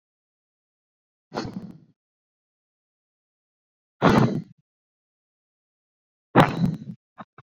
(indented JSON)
{
  "exhalation_length": "7.4 s",
  "exhalation_amplitude": 27493,
  "exhalation_signal_mean_std_ratio": 0.25,
  "survey_phase": "beta (2021-08-13 to 2022-03-07)",
  "age": "18-44",
  "gender": "Female",
  "wearing_mask": "No",
  "symptom_none": true,
  "smoker_status": "Current smoker (1 to 10 cigarettes per day)",
  "respiratory_condition_asthma": false,
  "respiratory_condition_other": false,
  "recruitment_source": "REACT",
  "submission_delay": "3 days",
  "covid_test_result": "Negative",
  "covid_test_method": "RT-qPCR"
}